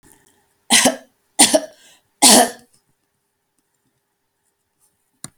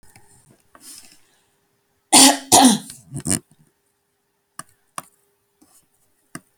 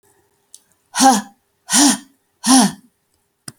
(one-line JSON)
{"three_cough_length": "5.4 s", "three_cough_amplitude": 32768, "three_cough_signal_mean_std_ratio": 0.28, "cough_length": "6.6 s", "cough_amplitude": 32768, "cough_signal_mean_std_ratio": 0.25, "exhalation_length": "3.6 s", "exhalation_amplitude": 32768, "exhalation_signal_mean_std_ratio": 0.38, "survey_phase": "alpha (2021-03-01 to 2021-08-12)", "age": "45-64", "gender": "Female", "wearing_mask": "No", "symptom_none": true, "smoker_status": "Ex-smoker", "respiratory_condition_asthma": false, "respiratory_condition_other": false, "recruitment_source": "REACT", "submission_delay": "2 days", "covid_test_result": "Negative", "covid_test_method": "RT-qPCR"}